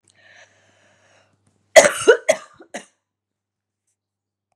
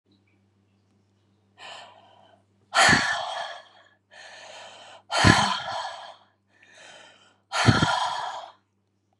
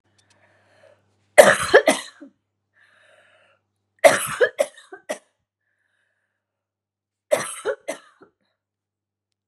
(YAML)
cough_length: 4.6 s
cough_amplitude: 32768
cough_signal_mean_std_ratio: 0.21
exhalation_length: 9.2 s
exhalation_amplitude: 30038
exhalation_signal_mean_std_ratio: 0.38
three_cough_length: 9.5 s
three_cough_amplitude: 32768
three_cough_signal_mean_std_ratio: 0.23
survey_phase: beta (2021-08-13 to 2022-03-07)
age: 45-64
gender: Female
wearing_mask: 'No'
symptom_headache: true
symptom_onset: 9 days
smoker_status: Ex-smoker
respiratory_condition_asthma: true
respiratory_condition_other: false
recruitment_source: REACT
submission_delay: 3 days
covid_test_result: Negative
covid_test_method: RT-qPCR
influenza_a_test_result: Negative
influenza_b_test_result: Negative